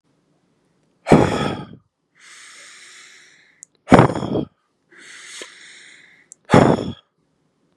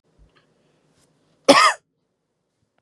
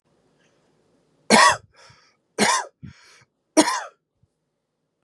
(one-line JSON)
{"exhalation_length": "7.8 s", "exhalation_amplitude": 32768, "exhalation_signal_mean_std_ratio": 0.29, "cough_length": "2.8 s", "cough_amplitude": 32768, "cough_signal_mean_std_ratio": 0.23, "three_cough_length": "5.0 s", "three_cough_amplitude": 32434, "three_cough_signal_mean_std_ratio": 0.29, "survey_phase": "beta (2021-08-13 to 2022-03-07)", "age": "18-44", "gender": "Male", "wearing_mask": "No", "symptom_none": true, "smoker_status": "Never smoked", "respiratory_condition_asthma": false, "respiratory_condition_other": false, "recruitment_source": "REACT", "submission_delay": "3 days", "covid_test_result": "Negative", "covid_test_method": "RT-qPCR", "influenza_a_test_result": "Negative", "influenza_b_test_result": "Negative"}